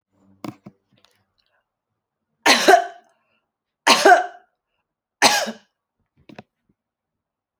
{"three_cough_length": "7.6 s", "three_cough_amplitude": 32767, "three_cough_signal_mean_std_ratio": 0.27, "survey_phase": "alpha (2021-03-01 to 2021-08-12)", "age": "45-64", "gender": "Female", "wearing_mask": "No", "symptom_none": true, "smoker_status": "Never smoked", "respiratory_condition_asthma": false, "respiratory_condition_other": false, "recruitment_source": "REACT", "submission_delay": "4 days", "covid_test_method": "RT-qPCR"}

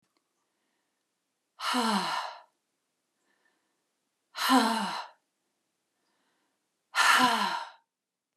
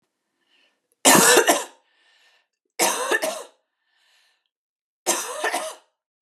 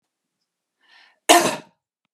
{"exhalation_length": "8.4 s", "exhalation_amplitude": 10719, "exhalation_signal_mean_std_ratio": 0.38, "three_cough_length": "6.4 s", "three_cough_amplitude": 32041, "three_cough_signal_mean_std_ratio": 0.36, "cough_length": "2.1 s", "cough_amplitude": 32768, "cough_signal_mean_std_ratio": 0.25, "survey_phase": "beta (2021-08-13 to 2022-03-07)", "age": "18-44", "gender": "Female", "wearing_mask": "No", "symptom_other": true, "symptom_onset": "12 days", "smoker_status": "Never smoked", "respiratory_condition_asthma": false, "respiratory_condition_other": false, "recruitment_source": "REACT", "submission_delay": "1 day", "covid_test_result": "Negative", "covid_test_method": "RT-qPCR", "influenza_a_test_result": "Negative", "influenza_b_test_result": "Negative"}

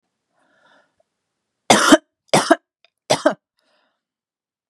{"three_cough_length": "4.7 s", "three_cough_amplitude": 32768, "three_cough_signal_mean_std_ratio": 0.26, "survey_phase": "beta (2021-08-13 to 2022-03-07)", "age": "18-44", "gender": "Female", "wearing_mask": "No", "symptom_cough_any": true, "symptom_runny_or_blocked_nose": true, "symptom_sore_throat": true, "symptom_fatigue": true, "symptom_headache": true, "symptom_change_to_sense_of_smell_or_taste": true, "symptom_loss_of_taste": true, "symptom_onset": "3 days", "smoker_status": "Never smoked", "respiratory_condition_asthma": false, "respiratory_condition_other": false, "recruitment_source": "Test and Trace", "submission_delay": "2 days", "covid_test_result": "Positive", "covid_test_method": "RT-qPCR", "covid_ct_value": 29.7, "covid_ct_gene": "ORF1ab gene", "covid_ct_mean": 30.0, "covid_viral_load": "140 copies/ml", "covid_viral_load_category": "Minimal viral load (< 10K copies/ml)"}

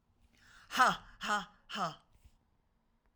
{"exhalation_length": "3.2 s", "exhalation_amplitude": 6867, "exhalation_signal_mean_std_ratio": 0.34, "survey_phase": "alpha (2021-03-01 to 2021-08-12)", "age": "45-64", "gender": "Female", "wearing_mask": "No", "symptom_none": true, "smoker_status": "Never smoked", "respiratory_condition_asthma": false, "respiratory_condition_other": false, "recruitment_source": "REACT", "submission_delay": "3 days", "covid_test_result": "Negative", "covid_test_method": "RT-qPCR"}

